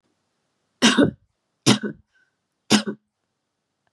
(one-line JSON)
{"three_cough_length": "3.9 s", "three_cough_amplitude": 28212, "three_cough_signal_mean_std_ratio": 0.3, "survey_phase": "beta (2021-08-13 to 2022-03-07)", "age": "18-44", "gender": "Female", "wearing_mask": "No", "symptom_none": true, "smoker_status": "Never smoked", "respiratory_condition_asthma": false, "respiratory_condition_other": false, "recruitment_source": "REACT", "submission_delay": "1 day", "covid_test_result": "Negative", "covid_test_method": "RT-qPCR", "influenza_a_test_result": "Negative", "influenza_b_test_result": "Negative"}